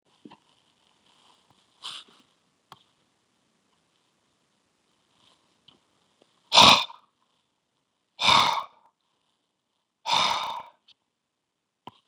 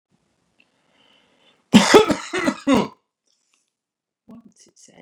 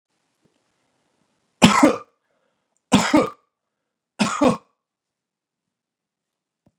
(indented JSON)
{
  "exhalation_length": "12.1 s",
  "exhalation_amplitude": 27166,
  "exhalation_signal_mean_std_ratio": 0.22,
  "cough_length": "5.0 s",
  "cough_amplitude": 32768,
  "cough_signal_mean_std_ratio": 0.28,
  "three_cough_length": "6.8 s",
  "three_cough_amplitude": 32768,
  "three_cough_signal_mean_std_ratio": 0.27,
  "survey_phase": "beta (2021-08-13 to 2022-03-07)",
  "age": "65+",
  "gender": "Male",
  "wearing_mask": "No",
  "symptom_none": true,
  "smoker_status": "Never smoked",
  "respiratory_condition_asthma": false,
  "respiratory_condition_other": false,
  "recruitment_source": "REACT",
  "submission_delay": "1 day",
  "covid_test_result": "Negative",
  "covid_test_method": "RT-qPCR"
}